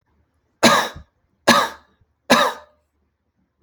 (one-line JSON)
{"three_cough_length": "3.6 s", "three_cough_amplitude": 32252, "three_cough_signal_mean_std_ratio": 0.34, "survey_phase": "alpha (2021-03-01 to 2021-08-12)", "age": "18-44", "gender": "Male", "wearing_mask": "No", "symptom_none": true, "smoker_status": "Never smoked", "respiratory_condition_asthma": false, "respiratory_condition_other": false, "recruitment_source": "REACT", "submission_delay": "1 day", "covid_test_result": "Negative", "covid_test_method": "RT-qPCR"}